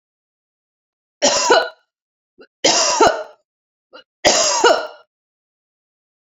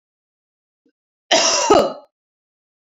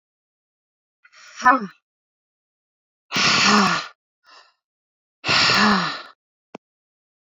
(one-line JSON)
{"three_cough_length": "6.2 s", "three_cough_amplitude": 32285, "three_cough_signal_mean_std_ratio": 0.41, "cough_length": "2.9 s", "cough_amplitude": 30124, "cough_signal_mean_std_ratio": 0.36, "exhalation_length": "7.3 s", "exhalation_amplitude": 27761, "exhalation_signal_mean_std_ratio": 0.38, "survey_phase": "beta (2021-08-13 to 2022-03-07)", "age": "18-44", "gender": "Female", "wearing_mask": "No", "symptom_none": true, "smoker_status": "Never smoked", "respiratory_condition_asthma": false, "respiratory_condition_other": false, "recruitment_source": "REACT", "submission_delay": "5 days", "covid_test_result": "Negative", "covid_test_method": "RT-qPCR"}